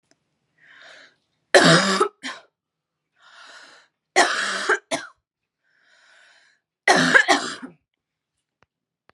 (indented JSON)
{
  "three_cough_length": "9.1 s",
  "three_cough_amplitude": 32767,
  "three_cough_signal_mean_std_ratio": 0.33,
  "survey_phase": "beta (2021-08-13 to 2022-03-07)",
  "age": "18-44",
  "gender": "Female",
  "wearing_mask": "No",
  "symptom_none": true,
  "smoker_status": "Never smoked",
  "respiratory_condition_asthma": false,
  "respiratory_condition_other": false,
  "recruitment_source": "REACT",
  "submission_delay": "1 day",
  "covid_test_result": "Negative",
  "covid_test_method": "RT-qPCR",
  "influenza_a_test_result": "Negative",
  "influenza_b_test_result": "Negative"
}